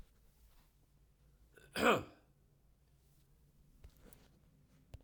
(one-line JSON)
{"cough_length": "5.0 s", "cough_amplitude": 4029, "cough_signal_mean_std_ratio": 0.23, "survey_phase": "beta (2021-08-13 to 2022-03-07)", "age": "18-44", "gender": "Male", "wearing_mask": "No", "symptom_cough_any": true, "symptom_runny_or_blocked_nose": true, "symptom_fatigue": true, "symptom_fever_high_temperature": true, "symptom_loss_of_taste": true, "symptom_onset": "3 days", "smoker_status": "Never smoked", "respiratory_condition_asthma": false, "respiratory_condition_other": false, "recruitment_source": "Test and Trace", "submission_delay": "2 days", "covid_test_result": "Positive", "covid_test_method": "RT-qPCR"}